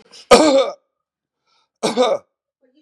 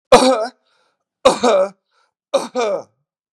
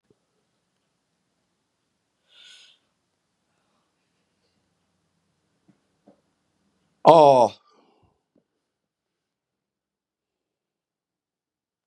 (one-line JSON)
{"cough_length": "2.8 s", "cough_amplitude": 32768, "cough_signal_mean_std_ratio": 0.39, "three_cough_length": "3.3 s", "three_cough_amplitude": 32768, "three_cough_signal_mean_std_ratio": 0.43, "exhalation_length": "11.9 s", "exhalation_amplitude": 32768, "exhalation_signal_mean_std_ratio": 0.15, "survey_phase": "beta (2021-08-13 to 2022-03-07)", "age": "45-64", "gender": "Male", "wearing_mask": "No", "symptom_none": true, "smoker_status": "Never smoked", "respiratory_condition_asthma": false, "respiratory_condition_other": false, "recruitment_source": "REACT", "submission_delay": "3 days", "covid_test_result": "Negative", "covid_test_method": "RT-qPCR", "influenza_a_test_result": "Negative", "influenza_b_test_result": "Negative"}